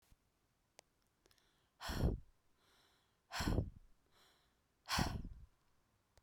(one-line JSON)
{"exhalation_length": "6.2 s", "exhalation_amplitude": 2507, "exhalation_signal_mean_std_ratio": 0.35, "survey_phase": "beta (2021-08-13 to 2022-03-07)", "age": "18-44", "gender": "Female", "wearing_mask": "No", "symptom_cough_any": true, "smoker_status": "Never smoked", "respiratory_condition_asthma": true, "respiratory_condition_other": false, "recruitment_source": "Test and Trace", "submission_delay": "1 day", "covid_test_result": "Positive", "covid_test_method": "RT-qPCR"}